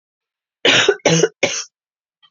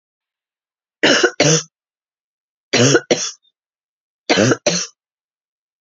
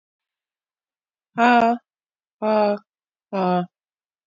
{"cough_length": "2.3 s", "cough_amplitude": 32767, "cough_signal_mean_std_ratio": 0.43, "three_cough_length": "5.8 s", "three_cough_amplitude": 32767, "three_cough_signal_mean_std_ratio": 0.38, "exhalation_length": "4.3 s", "exhalation_amplitude": 23733, "exhalation_signal_mean_std_ratio": 0.38, "survey_phase": "beta (2021-08-13 to 2022-03-07)", "age": "45-64", "gender": "Female", "wearing_mask": "No", "symptom_sore_throat": true, "smoker_status": "Never smoked", "respiratory_condition_asthma": false, "respiratory_condition_other": false, "recruitment_source": "Test and Trace", "submission_delay": "2 days", "covid_test_result": "Positive", "covid_test_method": "RT-qPCR", "covid_ct_value": 17.7, "covid_ct_gene": "ORF1ab gene"}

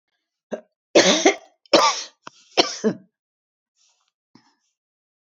{"three_cough_length": "5.2 s", "three_cough_amplitude": 29025, "three_cough_signal_mean_std_ratio": 0.31, "survey_phase": "beta (2021-08-13 to 2022-03-07)", "age": "65+", "gender": "Female", "wearing_mask": "No", "symptom_none": true, "smoker_status": "Never smoked", "respiratory_condition_asthma": false, "respiratory_condition_other": false, "recruitment_source": "REACT", "submission_delay": "6 days", "covid_test_result": "Negative", "covid_test_method": "RT-qPCR"}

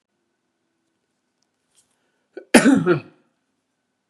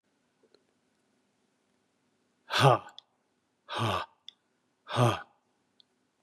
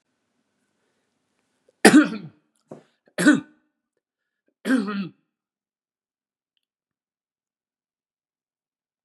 {"cough_length": "4.1 s", "cough_amplitude": 32768, "cough_signal_mean_std_ratio": 0.24, "exhalation_length": "6.2 s", "exhalation_amplitude": 13202, "exhalation_signal_mean_std_ratio": 0.27, "three_cough_length": "9.0 s", "three_cough_amplitude": 32768, "three_cough_signal_mean_std_ratio": 0.21, "survey_phase": "beta (2021-08-13 to 2022-03-07)", "age": "65+", "gender": "Male", "wearing_mask": "No", "symptom_none": true, "smoker_status": "Ex-smoker", "respiratory_condition_asthma": false, "respiratory_condition_other": false, "recruitment_source": "REACT", "submission_delay": "2 days", "covid_test_result": "Negative", "covid_test_method": "RT-qPCR", "influenza_a_test_result": "Negative", "influenza_b_test_result": "Negative"}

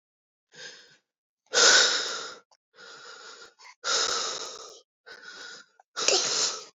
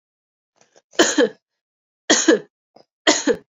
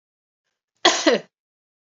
{"exhalation_length": "6.7 s", "exhalation_amplitude": 17764, "exhalation_signal_mean_std_ratio": 0.43, "three_cough_length": "3.6 s", "three_cough_amplitude": 29934, "three_cough_signal_mean_std_ratio": 0.36, "cough_length": "2.0 s", "cough_amplitude": 28108, "cough_signal_mean_std_ratio": 0.29, "survey_phase": "beta (2021-08-13 to 2022-03-07)", "age": "18-44", "gender": "Female", "wearing_mask": "No", "symptom_none": true, "smoker_status": "Never smoked", "respiratory_condition_asthma": false, "respiratory_condition_other": false, "recruitment_source": "REACT", "submission_delay": "1 day", "covid_test_result": "Negative", "covid_test_method": "RT-qPCR", "influenza_a_test_result": "Negative", "influenza_b_test_result": "Negative"}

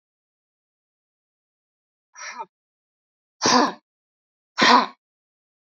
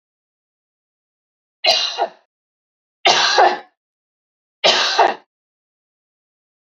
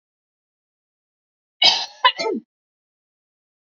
{"exhalation_length": "5.7 s", "exhalation_amplitude": 26607, "exhalation_signal_mean_std_ratio": 0.25, "three_cough_length": "6.7 s", "three_cough_amplitude": 30730, "three_cough_signal_mean_std_ratio": 0.35, "cough_length": "3.8 s", "cough_amplitude": 32768, "cough_signal_mean_std_ratio": 0.25, "survey_phase": "beta (2021-08-13 to 2022-03-07)", "age": "45-64", "gender": "Female", "wearing_mask": "No", "symptom_fatigue": true, "symptom_change_to_sense_of_smell_or_taste": true, "symptom_onset": "12 days", "smoker_status": "Ex-smoker", "respiratory_condition_asthma": false, "respiratory_condition_other": false, "recruitment_source": "REACT", "submission_delay": "2 days", "covid_test_result": "Negative", "covid_test_method": "RT-qPCR"}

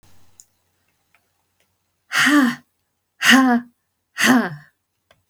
{"exhalation_length": "5.3 s", "exhalation_amplitude": 32459, "exhalation_signal_mean_std_ratio": 0.39, "survey_phase": "beta (2021-08-13 to 2022-03-07)", "age": "65+", "gender": "Female", "wearing_mask": "No", "symptom_none": true, "smoker_status": "Ex-smoker", "respiratory_condition_asthma": false, "respiratory_condition_other": false, "recruitment_source": "REACT", "submission_delay": "1 day", "covid_test_result": "Negative", "covid_test_method": "RT-qPCR"}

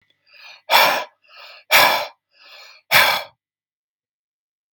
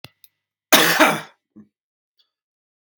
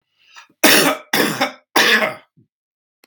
{"exhalation_length": "4.7 s", "exhalation_amplitude": 32768, "exhalation_signal_mean_std_ratio": 0.36, "cough_length": "3.0 s", "cough_amplitude": 32767, "cough_signal_mean_std_ratio": 0.3, "three_cough_length": "3.1 s", "three_cough_amplitude": 32768, "three_cough_signal_mean_std_ratio": 0.47, "survey_phase": "beta (2021-08-13 to 2022-03-07)", "age": "45-64", "gender": "Male", "wearing_mask": "No", "symptom_fatigue": true, "smoker_status": "Never smoked", "respiratory_condition_asthma": false, "respiratory_condition_other": false, "recruitment_source": "REACT", "submission_delay": "0 days", "covid_test_result": "Negative", "covid_test_method": "RT-qPCR", "influenza_a_test_result": "Negative", "influenza_b_test_result": "Negative"}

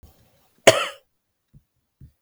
{"cough_length": "2.2 s", "cough_amplitude": 32768, "cough_signal_mean_std_ratio": 0.19, "survey_phase": "beta (2021-08-13 to 2022-03-07)", "age": "18-44", "gender": "Female", "wearing_mask": "No", "symptom_cough_any": true, "symptom_runny_or_blocked_nose": true, "symptom_sore_throat": true, "symptom_abdominal_pain": true, "symptom_headache": true, "symptom_change_to_sense_of_smell_or_taste": true, "smoker_status": "Ex-smoker", "respiratory_condition_asthma": false, "respiratory_condition_other": false, "recruitment_source": "Test and Trace", "submission_delay": "2 days", "covid_test_result": "Positive", "covid_test_method": "RT-qPCR", "covid_ct_value": 31.2, "covid_ct_gene": "ORF1ab gene"}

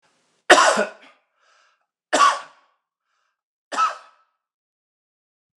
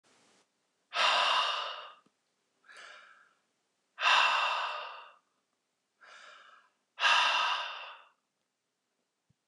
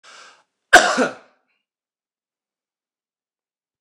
{"three_cough_length": "5.6 s", "three_cough_amplitude": 29204, "three_cough_signal_mean_std_ratio": 0.28, "exhalation_length": "9.5 s", "exhalation_amplitude": 8365, "exhalation_signal_mean_std_ratio": 0.42, "cough_length": "3.8 s", "cough_amplitude": 29204, "cough_signal_mean_std_ratio": 0.21, "survey_phase": "beta (2021-08-13 to 2022-03-07)", "age": "45-64", "gender": "Male", "wearing_mask": "No", "symptom_none": true, "smoker_status": "Never smoked", "respiratory_condition_asthma": false, "respiratory_condition_other": false, "recruitment_source": "REACT", "submission_delay": "1 day", "covid_test_result": "Negative", "covid_test_method": "RT-qPCR", "influenza_a_test_result": "Negative", "influenza_b_test_result": "Negative"}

